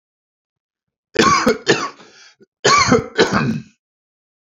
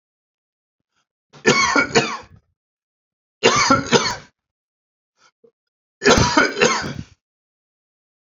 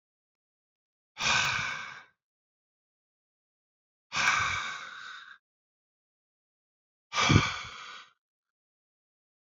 {"cough_length": "4.5 s", "cough_amplitude": 32083, "cough_signal_mean_std_ratio": 0.45, "three_cough_length": "8.3 s", "three_cough_amplitude": 31374, "three_cough_signal_mean_std_ratio": 0.39, "exhalation_length": "9.5 s", "exhalation_amplitude": 16694, "exhalation_signal_mean_std_ratio": 0.34, "survey_phase": "beta (2021-08-13 to 2022-03-07)", "age": "45-64", "gender": "Male", "wearing_mask": "No", "symptom_none": true, "smoker_status": "Never smoked", "respiratory_condition_asthma": false, "respiratory_condition_other": false, "recruitment_source": "REACT", "submission_delay": "1 day", "covid_test_result": "Negative", "covid_test_method": "RT-qPCR", "influenza_a_test_result": "Negative", "influenza_b_test_result": "Negative"}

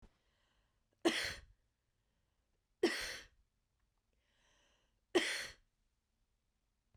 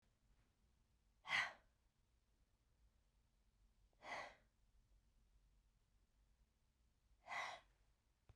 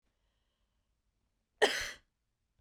{"three_cough_length": "7.0 s", "three_cough_amplitude": 3953, "three_cough_signal_mean_std_ratio": 0.27, "exhalation_length": "8.4 s", "exhalation_amplitude": 1115, "exhalation_signal_mean_std_ratio": 0.27, "cough_length": "2.6 s", "cough_amplitude": 7710, "cough_signal_mean_std_ratio": 0.22, "survey_phase": "beta (2021-08-13 to 2022-03-07)", "age": "45-64", "gender": "Female", "wearing_mask": "No", "symptom_none": true, "smoker_status": "Never smoked", "respiratory_condition_asthma": true, "respiratory_condition_other": false, "recruitment_source": "REACT", "submission_delay": "2 days", "covid_test_result": "Negative", "covid_test_method": "RT-qPCR"}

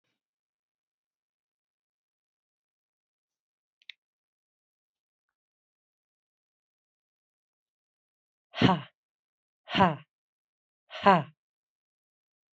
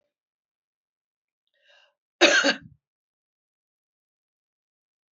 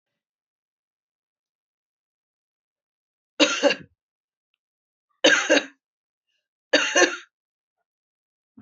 {"exhalation_length": "12.5 s", "exhalation_amplitude": 17861, "exhalation_signal_mean_std_ratio": 0.16, "cough_length": "5.1 s", "cough_amplitude": 22316, "cough_signal_mean_std_ratio": 0.2, "three_cough_length": "8.6 s", "three_cough_amplitude": 21871, "three_cough_signal_mean_std_ratio": 0.26, "survey_phase": "beta (2021-08-13 to 2022-03-07)", "age": "65+", "gender": "Female", "wearing_mask": "No", "symptom_runny_or_blocked_nose": true, "smoker_status": "Ex-smoker", "respiratory_condition_asthma": false, "respiratory_condition_other": false, "recruitment_source": "REACT", "submission_delay": "2 days", "covid_test_result": "Negative", "covid_test_method": "RT-qPCR", "influenza_a_test_result": "Negative", "influenza_b_test_result": "Negative"}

